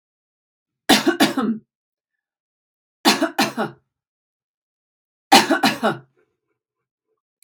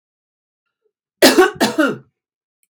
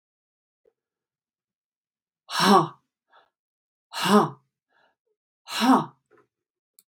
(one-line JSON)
{"three_cough_length": "7.4 s", "three_cough_amplitude": 32767, "three_cough_signal_mean_std_ratio": 0.33, "cough_length": "2.7 s", "cough_amplitude": 32768, "cough_signal_mean_std_ratio": 0.35, "exhalation_length": "6.9 s", "exhalation_amplitude": 20473, "exhalation_signal_mean_std_ratio": 0.28, "survey_phase": "beta (2021-08-13 to 2022-03-07)", "age": "45-64", "gender": "Female", "wearing_mask": "No", "symptom_cough_any": true, "smoker_status": "Never smoked", "respiratory_condition_asthma": false, "respiratory_condition_other": false, "recruitment_source": "REACT", "submission_delay": "1 day", "covid_test_result": "Negative", "covid_test_method": "RT-qPCR"}